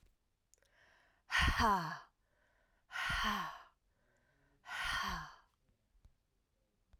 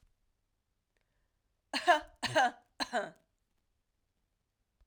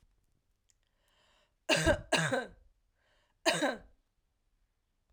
{"exhalation_length": "7.0 s", "exhalation_amplitude": 3234, "exhalation_signal_mean_std_ratio": 0.41, "three_cough_length": "4.9 s", "three_cough_amplitude": 7225, "three_cough_signal_mean_std_ratio": 0.27, "cough_length": "5.1 s", "cough_amplitude": 6552, "cough_signal_mean_std_ratio": 0.34, "survey_phase": "alpha (2021-03-01 to 2021-08-12)", "age": "45-64", "gender": "Female", "wearing_mask": "No", "symptom_cough_any": true, "symptom_shortness_of_breath": true, "symptom_headache": true, "symptom_change_to_sense_of_smell_or_taste": true, "smoker_status": "Ex-smoker", "respiratory_condition_asthma": false, "respiratory_condition_other": false, "recruitment_source": "Test and Trace", "submission_delay": "2 days", "covid_test_result": "Positive", "covid_test_method": "RT-qPCR"}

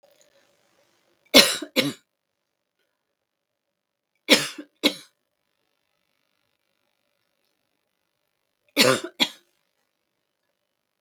{"three_cough_length": "11.0 s", "three_cough_amplitude": 32768, "three_cough_signal_mean_std_ratio": 0.2, "survey_phase": "beta (2021-08-13 to 2022-03-07)", "age": "65+", "gender": "Female", "wearing_mask": "No", "symptom_cough_any": true, "smoker_status": "Never smoked", "respiratory_condition_asthma": false, "respiratory_condition_other": false, "recruitment_source": "REACT", "submission_delay": "0 days", "covid_test_result": "Negative", "covid_test_method": "RT-qPCR", "influenza_a_test_result": "Negative", "influenza_b_test_result": "Negative"}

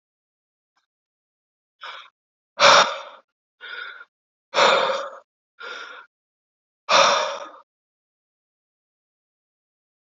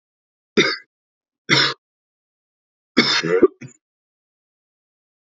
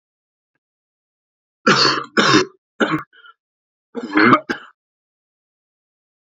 {"exhalation_length": "10.2 s", "exhalation_amplitude": 27577, "exhalation_signal_mean_std_ratio": 0.29, "three_cough_length": "5.3 s", "three_cough_amplitude": 32768, "three_cough_signal_mean_std_ratio": 0.31, "cough_length": "6.4 s", "cough_amplitude": 32768, "cough_signal_mean_std_ratio": 0.34, "survey_phase": "alpha (2021-03-01 to 2021-08-12)", "age": "18-44", "gender": "Male", "wearing_mask": "No", "symptom_cough_any": true, "symptom_fatigue": true, "symptom_headache": true, "symptom_change_to_sense_of_smell_or_taste": true, "symptom_loss_of_taste": true, "symptom_onset": "2 days", "smoker_status": "Current smoker (e-cigarettes or vapes only)", "respiratory_condition_asthma": false, "respiratory_condition_other": false, "recruitment_source": "Test and Trace", "submission_delay": "2 days", "covid_test_result": "Positive", "covid_test_method": "RT-qPCR", "covid_ct_value": 17.8, "covid_ct_gene": "ORF1ab gene"}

